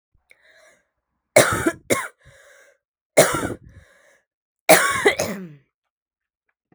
{
  "three_cough_length": "6.7 s",
  "three_cough_amplitude": 32768,
  "three_cough_signal_mean_std_ratio": 0.32,
  "survey_phase": "beta (2021-08-13 to 2022-03-07)",
  "age": "18-44",
  "gender": "Female",
  "wearing_mask": "No",
  "symptom_cough_any": true,
  "symptom_runny_or_blocked_nose": true,
  "symptom_sore_throat": true,
  "symptom_headache": true,
  "smoker_status": "Never smoked",
  "respiratory_condition_asthma": false,
  "respiratory_condition_other": false,
  "recruitment_source": "Test and Trace",
  "submission_delay": "1 day",
  "covid_test_result": "Positive",
  "covid_test_method": "RT-qPCR",
  "covid_ct_value": 20.0,
  "covid_ct_gene": "ORF1ab gene",
  "covid_ct_mean": 20.5,
  "covid_viral_load": "190000 copies/ml",
  "covid_viral_load_category": "Low viral load (10K-1M copies/ml)"
}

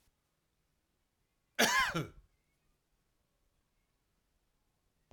{
  "cough_length": "5.1 s",
  "cough_amplitude": 7529,
  "cough_signal_mean_std_ratio": 0.23,
  "survey_phase": "alpha (2021-03-01 to 2021-08-12)",
  "age": "65+",
  "gender": "Male",
  "wearing_mask": "No",
  "symptom_none": true,
  "smoker_status": "Ex-smoker",
  "respiratory_condition_asthma": false,
  "respiratory_condition_other": false,
  "recruitment_source": "REACT",
  "submission_delay": "2 days",
  "covid_test_result": "Negative",
  "covid_test_method": "RT-qPCR"
}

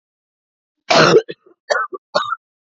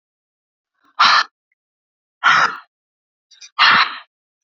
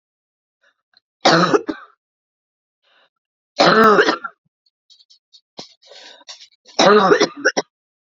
{
  "cough_length": "2.6 s",
  "cough_amplitude": 28651,
  "cough_signal_mean_std_ratio": 0.39,
  "exhalation_length": "4.4 s",
  "exhalation_amplitude": 31379,
  "exhalation_signal_mean_std_ratio": 0.36,
  "three_cough_length": "8.0 s",
  "three_cough_amplitude": 32768,
  "three_cough_signal_mean_std_ratio": 0.36,
  "survey_phase": "beta (2021-08-13 to 2022-03-07)",
  "age": "45-64",
  "gender": "Female",
  "wearing_mask": "No",
  "symptom_cough_any": true,
  "smoker_status": "Ex-smoker",
  "respiratory_condition_asthma": false,
  "respiratory_condition_other": false,
  "recruitment_source": "Test and Trace",
  "submission_delay": "1 day",
  "covid_test_result": "Positive",
  "covid_test_method": "RT-qPCR",
  "covid_ct_value": 34.0,
  "covid_ct_gene": "ORF1ab gene"
}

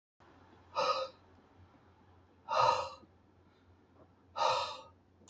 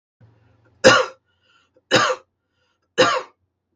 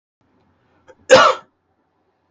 {
  "exhalation_length": "5.3 s",
  "exhalation_amplitude": 6056,
  "exhalation_signal_mean_std_ratio": 0.39,
  "three_cough_length": "3.8 s",
  "three_cough_amplitude": 32173,
  "three_cough_signal_mean_std_ratio": 0.32,
  "cough_length": "2.3 s",
  "cough_amplitude": 32699,
  "cough_signal_mean_std_ratio": 0.26,
  "survey_phase": "beta (2021-08-13 to 2022-03-07)",
  "age": "45-64",
  "gender": "Male",
  "wearing_mask": "No",
  "symptom_none": true,
  "smoker_status": "Never smoked",
  "respiratory_condition_asthma": false,
  "respiratory_condition_other": false,
  "recruitment_source": "REACT",
  "submission_delay": "1 day",
  "covid_test_result": "Negative",
  "covid_test_method": "RT-qPCR",
  "influenza_a_test_result": "Negative",
  "influenza_b_test_result": "Negative"
}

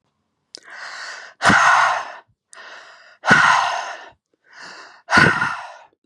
{
  "exhalation_length": "6.1 s",
  "exhalation_amplitude": 32314,
  "exhalation_signal_mean_std_ratio": 0.46,
  "survey_phase": "beta (2021-08-13 to 2022-03-07)",
  "age": "18-44",
  "gender": "Female",
  "wearing_mask": "No",
  "symptom_none": true,
  "smoker_status": "Current smoker (1 to 10 cigarettes per day)",
  "respiratory_condition_asthma": false,
  "respiratory_condition_other": false,
  "recruitment_source": "REACT",
  "submission_delay": "3 days",
  "covid_test_result": "Negative",
  "covid_test_method": "RT-qPCR",
  "influenza_a_test_result": "Negative",
  "influenza_b_test_result": "Negative"
}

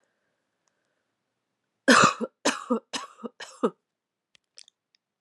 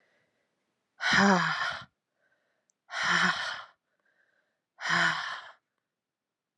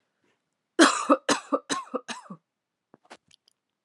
{
  "three_cough_length": "5.2 s",
  "three_cough_amplitude": 18483,
  "three_cough_signal_mean_std_ratio": 0.26,
  "exhalation_length": "6.6 s",
  "exhalation_amplitude": 13306,
  "exhalation_signal_mean_std_ratio": 0.41,
  "cough_length": "3.8 s",
  "cough_amplitude": 27945,
  "cough_signal_mean_std_ratio": 0.29,
  "survey_phase": "alpha (2021-03-01 to 2021-08-12)",
  "age": "45-64",
  "gender": "Female",
  "wearing_mask": "No",
  "symptom_fatigue": true,
  "symptom_headache": true,
  "symptom_onset": "3 days",
  "smoker_status": "Never smoked",
  "respiratory_condition_asthma": false,
  "respiratory_condition_other": false,
  "recruitment_source": "Test and Trace",
  "submission_delay": "1 day",
  "covid_test_result": "Positive",
  "covid_test_method": "RT-qPCR"
}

